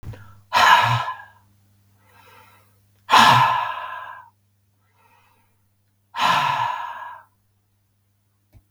{"exhalation_length": "8.7 s", "exhalation_amplitude": 32766, "exhalation_signal_mean_std_ratio": 0.38, "survey_phase": "beta (2021-08-13 to 2022-03-07)", "age": "65+", "gender": "Female", "wearing_mask": "No", "symptom_none": true, "smoker_status": "Ex-smoker", "respiratory_condition_asthma": false, "respiratory_condition_other": false, "recruitment_source": "REACT", "submission_delay": "1 day", "covid_test_result": "Negative", "covid_test_method": "RT-qPCR"}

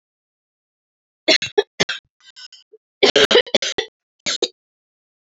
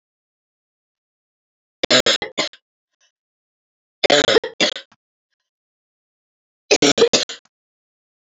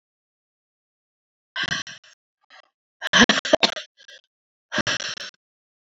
{"cough_length": "5.3 s", "cough_amplitude": 31121, "cough_signal_mean_std_ratio": 0.3, "three_cough_length": "8.4 s", "three_cough_amplitude": 30143, "three_cough_signal_mean_std_ratio": 0.28, "exhalation_length": "6.0 s", "exhalation_amplitude": 32767, "exhalation_signal_mean_std_ratio": 0.27, "survey_phase": "alpha (2021-03-01 to 2021-08-12)", "age": "45-64", "gender": "Female", "wearing_mask": "No", "symptom_cough_any": true, "symptom_new_continuous_cough": true, "symptom_shortness_of_breath": true, "symptom_fatigue": true, "symptom_change_to_sense_of_smell_or_taste": true, "symptom_loss_of_taste": true, "symptom_onset": "6 days", "smoker_status": "Ex-smoker", "respiratory_condition_asthma": false, "respiratory_condition_other": false, "recruitment_source": "Test and Trace", "submission_delay": "2 days", "covid_test_result": "Positive", "covid_test_method": "RT-qPCR", "covid_ct_value": 16.0, "covid_ct_gene": "ORF1ab gene", "covid_ct_mean": 16.3, "covid_viral_load": "4600000 copies/ml", "covid_viral_load_category": "High viral load (>1M copies/ml)"}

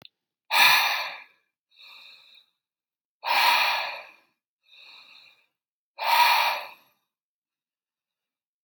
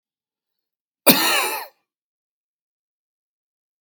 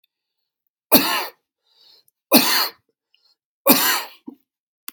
{"exhalation_length": "8.6 s", "exhalation_amplitude": 17004, "exhalation_signal_mean_std_ratio": 0.38, "cough_length": "3.8 s", "cough_amplitude": 32768, "cough_signal_mean_std_ratio": 0.26, "three_cough_length": "4.9 s", "three_cough_amplitude": 32768, "three_cough_signal_mean_std_ratio": 0.34, "survey_phase": "beta (2021-08-13 to 2022-03-07)", "age": "18-44", "gender": "Male", "wearing_mask": "No", "symptom_none": true, "smoker_status": "Ex-smoker", "respiratory_condition_asthma": false, "respiratory_condition_other": false, "recruitment_source": "REACT", "submission_delay": "5 days", "covid_test_result": "Negative", "covid_test_method": "RT-qPCR", "influenza_a_test_result": "Negative", "influenza_b_test_result": "Negative"}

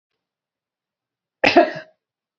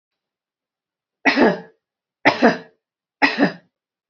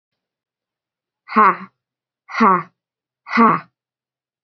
{"cough_length": "2.4 s", "cough_amplitude": 32768, "cough_signal_mean_std_ratio": 0.24, "three_cough_length": "4.1 s", "three_cough_amplitude": 28429, "three_cough_signal_mean_std_ratio": 0.34, "exhalation_length": "4.4 s", "exhalation_amplitude": 29752, "exhalation_signal_mean_std_ratio": 0.31, "survey_phase": "beta (2021-08-13 to 2022-03-07)", "age": "45-64", "gender": "Female", "wearing_mask": "No", "symptom_none": true, "symptom_onset": "9 days", "smoker_status": "Never smoked", "respiratory_condition_asthma": false, "respiratory_condition_other": false, "recruitment_source": "REACT", "submission_delay": "1 day", "covid_test_result": "Negative", "covid_test_method": "RT-qPCR", "influenza_a_test_result": "Negative", "influenza_b_test_result": "Negative"}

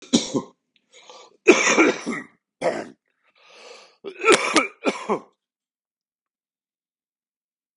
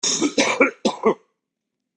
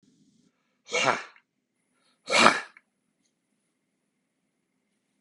{"three_cough_length": "7.8 s", "three_cough_amplitude": 32768, "three_cough_signal_mean_std_ratio": 0.34, "cough_length": "2.0 s", "cough_amplitude": 24184, "cough_signal_mean_std_ratio": 0.51, "exhalation_length": "5.2 s", "exhalation_amplitude": 27481, "exhalation_signal_mean_std_ratio": 0.23, "survey_phase": "beta (2021-08-13 to 2022-03-07)", "age": "45-64", "gender": "Male", "wearing_mask": "No", "symptom_cough_any": true, "symptom_runny_or_blocked_nose": true, "symptom_fatigue": true, "smoker_status": "Ex-smoker", "respiratory_condition_asthma": false, "respiratory_condition_other": false, "recruitment_source": "Test and Trace", "submission_delay": "2 days", "covid_test_result": "Positive", "covid_test_method": "RT-qPCR", "covid_ct_value": 21.8, "covid_ct_gene": "ORF1ab gene"}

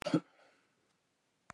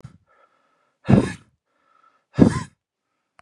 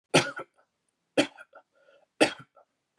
{"cough_length": "1.5 s", "cough_amplitude": 4750, "cough_signal_mean_std_ratio": 0.22, "exhalation_length": "3.4 s", "exhalation_amplitude": 31977, "exhalation_signal_mean_std_ratio": 0.25, "three_cough_length": "3.0 s", "three_cough_amplitude": 15613, "three_cough_signal_mean_std_ratio": 0.26, "survey_phase": "beta (2021-08-13 to 2022-03-07)", "age": "45-64", "gender": "Male", "wearing_mask": "No", "symptom_runny_or_blocked_nose": true, "symptom_diarrhoea": true, "symptom_fatigue": true, "smoker_status": "Ex-smoker", "respiratory_condition_asthma": false, "respiratory_condition_other": false, "recruitment_source": "Test and Trace", "submission_delay": "2 days", "covid_test_result": "Positive", "covid_test_method": "ePCR"}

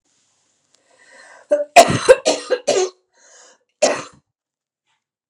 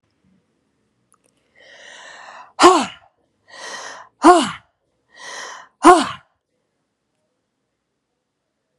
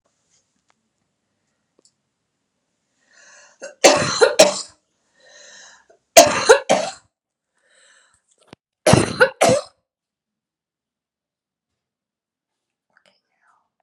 {"cough_length": "5.3 s", "cough_amplitude": 32768, "cough_signal_mean_std_ratio": 0.31, "exhalation_length": "8.8 s", "exhalation_amplitude": 32768, "exhalation_signal_mean_std_ratio": 0.25, "three_cough_length": "13.8 s", "three_cough_amplitude": 32768, "three_cough_signal_mean_std_ratio": 0.25, "survey_phase": "beta (2021-08-13 to 2022-03-07)", "age": "45-64", "gender": "Female", "wearing_mask": "No", "symptom_none": true, "smoker_status": "Ex-smoker", "respiratory_condition_asthma": false, "respiratory_condition_other": false, "recruitment_source": "REACT", "submission_delay": "3 days", "covid_test_result": "Negative", "covid_test_method": "RT-qPCR"}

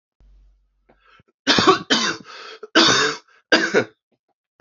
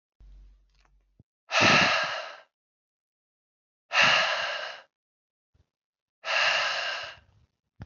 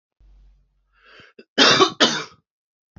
{"three_cough_length": "4.6 s", "three_cough_amplitude": 28677, "three_cough_signal_mean_std_ratio": 0.42, "exhalation_length": "7.9 s", "exhalation_amplitude": 14639, "exhalation_signal_mean_std_ratio": 0.42, "cough_length": "3.0 s", "cough_amplitude": 29116, "cough_signal_mean_std_ratio": 0.33, "survey_phase": "alpha (2021-03-01 to 2021-08-12)", "age": "18-44", "gender": "Male", "wearing_mask": "No", "symptom_cough_any": true, "symptom_onset": "3 days", "smoker_status": "Never smoked", "respiratory_condition_asthma": false, "respiratory_condition_other": false, "recruitment_source": "Test and Trace", "submission_delay": "2 days", "covid_test_result": "Positive", "covid_test_method": "RT-qPCR"}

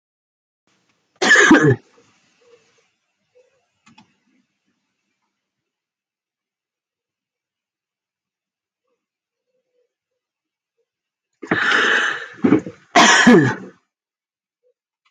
{"cough_length": "15.1 s", "cough_amplitude": 30650, "cough_signal_mean_std_ratio": 0.29, "survey_phase": "alpha (2021-03-01 to 2021-08-12)", "age": "45-64", "gender": "Female", "wearing_mask": "No", "symptom_none": true, "smoker_status": "Never smoked", "respiratory_condition_asthma": false, "respiratory_condition_other": false, "recruitment_source": "REACT", "submission_delay": "3 days", "covid_test_result": "Negative", "covid_test_method": "RT-qPCR", "covid_ct_value": 42.0, "covid_ct_gene": "N gene"}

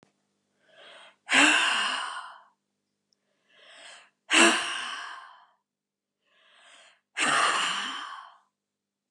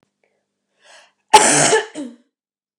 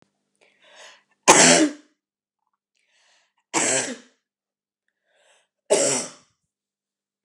{"exhalation_length": "9.1 s", "exhalation_amplitude": 20462, "exhalation_signal_mean_std_ratio": 0.4, "cough_length": "2.8 s", "cough_amplitude": 32768, "cough_signal_mean_std_ratio": 0.34, "three_cough_length": "7.2 s", "three_cough_amplitude": 32767, "three_cough_signal_mean_std_ratio": 0.29, "survey_phase": "alpha (2021-03-01 to 2021-08-12)", "age": "45-64", "gender": "Female", "wearing_mask": "No", "symptom_none": true, "smoker_status": "Never smoked", "respiratory_condition_asthma": true, "respiratory_condition_other": false, "recruitment_source": "REACT", "submission_delay": "3 days", "covid_test_result": "Negative", "covid_test_method": "RT-qPCR"}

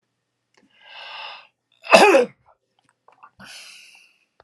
{"cough_length": "4.4 s", "cough_amplitude": 32768, "cough_signal_mean_std_ratio": 0.25, "survey_phase": "alpha (2021-03-01 to 2021-08-12)", "age": "65+", "gender": "Male", "wearing_mask": "No", "symptom_none": true, "smoker_status": "Never smoked", "respiratory_condition_asthma": false, "respiratory_condition_other": false, "recruitment_source": "REACT", "submission_delay": "3 days", "covid_test_result": "Negative", "covid_test_method": "RT-qPCR"}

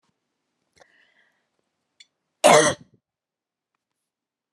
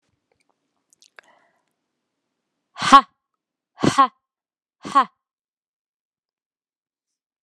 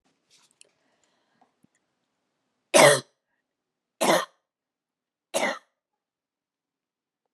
{"cough_length": "4.5 s", "cough_amplitude": 27154, "cough_signal_mean_std_ratio": 0.2, "exhalation_length": "7.4 s", "exhalation_amplitude": 32768, "exhalation_signal_mean_std_ratio": 0.18, "three_cough_length": "7.3 s", "three_cough_amplitude": 27821, "three_cough_signal_mean_std_ratio": 0.21, "survey_phase": "alpha (2021-03-01 to 2021-08-12)", "age": "45-64", "gender": "Female", "wearing_mask": "Yes", "symptom_cough_any": true, "symptom_shortness_of_breath": true, "symptom_fatigue": true, "symptom_fever_high_temperature": true, "symptom_headache": true, "symptom_change_to_sense_of_smell_or_taste": true, "symptom_onset": "5 days", "smoker_status": "Never smoked", "respiratory_condition_asthma": false, "respiratory_condition_other": false, "recruitment_source": "Test and Trace", "submission_delay": "2 days", "covid_test_result": "Positive", "covid_test_method": "RT-qPCR", "covid_ct_value": 27.8, "covid_ct_gene": "N gene"}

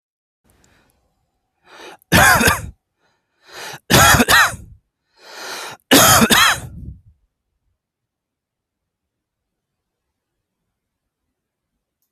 {"three_cough_length": "12.1 s", "three_cough_amplitude": 32768, "three_cough_signal_mean_std_ratio": 0.32, "survey_phase": "beta (2021-08-13 to 2022-03-07)", "age": "45-64", "gender": "Male", "wearing_mask": "No", "symptom_none": true, "smoker_status": "Ex-smoker", "respiratory_condition_asthma": false, "respiratory_condition_other": false, "recruitment_source": "REACT", "submission_delay": "2 days", "covid_test_result": "Negative", "covid_test_method": "RT-qPCR"}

